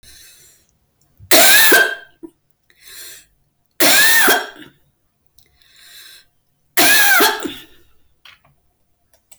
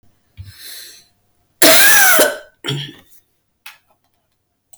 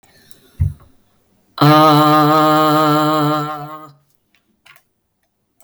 {"three_cough_length": "9.4 s", "three_cough_amplitude": 32768, "three_cough_signal_mean_std_ratio": 0.44, "cough_length": "4.8 s", "cough_amplitude": 32768, "cough_signal_mean_std_ratio": 0.39, "exhalation_length": "5.6 s", "exhalation_amplitude": 32768, "exhalation_signal_mean_std_ratio": 0.57, "survey_phase": "beta (2021-08-13 to 2022-03-07)", "age": "45-64", "gender": "Female", "wearing_mask": "No", "symptom_none": true, "symptom_onset": "4 days", "smoker_status": "Never smoked", "respiratory_condition_asthma": false, "respiratory_condition_other": false, "recruitment_source": "Test and Trace", "submission_delay": "2 days", "covid_test_result": "Positive", "covid_test_method": "ePCR"}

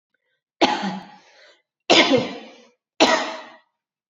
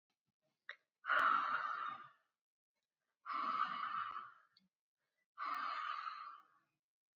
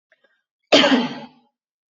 {"three_cough_length": "4.1 s", "three_cough_amplitude": 28406, "three_cough_signal_mean_std_ratio": 0.39, "exhalation_length": "7.2 s", "exhalation_amplitude": 2467, "exhalation_signal_mean_std_ratio": 0.5, "cough_length": "2.0 s", "cough_amplitude": 27467, "cough_signal_mean_std_ratio": 0.35, "survey_phase": "beta (2021-08-13 to 2022-03-07)", "age": "45-64", "gender": "Female", "wearing_mask": "No", "symptom_none": true, "smoker_status": "Never smoked", "respiratory_condition_asthma": false, "respiratory_condition_other": false, "recruitment_source": "REACT", "submission_delay": "1 day", "covid_test_result": "Negative", "covid_test_method": "RT-qPCR"}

